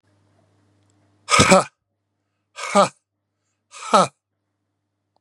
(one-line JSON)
{"exhalation_length": "5.2 s", "exhalation_amplitude": 32767, "exhalation_signal_mean_std_ratio": 0.28, "survey_phase": "beta (2021-08-13 to 2022-03-07)", "age": "45-64", "gender": "Male", "wearing_mask": "No", "symptom_runny_or_blocked_nose": true, "symptom_sore_throat": true, "symptom_onset": "3 days", "smoker_status": "Never smoked", "respiratory_condition_asthma": false, "respiratory_condition_other": false, "recruitment_source": "Test and Trace", "submission_delay": "1 day", "covid_test_result": "Positive", "covid_test_method": "ePCR"}